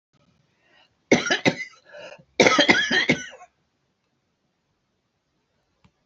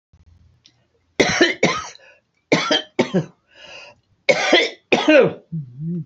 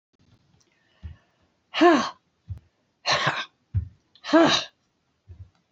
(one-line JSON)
{"cough_length": "6.1 s", "cough_amplitude": 28799, "cough_signal_mean_std_ratio": 0.32, "three_cough_length": "6.1 s", "three_cough_amplitude": 27959, "three_cough_signal_mean_std_ratio": 0.46, "exhalation_length": "5.7 s", "exhalation_amplitude": 19305, "exhalation_signal_mean_std_ratio": 0.33, "survey_phase": "beta (2021-08-13 to 2022-03-07)", "age": "65+", "gender": "Female", "wearing_mask": "No", "symptom_none": true, "smoker_status": "Never smoked", "respiratory_condition_asthma": false, "respiratory_condition_other": false, "recruitment_source": "REACT", "submission_delay": "2 days", "covid_test_result": "Negative", "covid_test_method": "RT-qPCR", "influenza_a_test_result": "Negative", "influenza_b_test_result": "Negative"}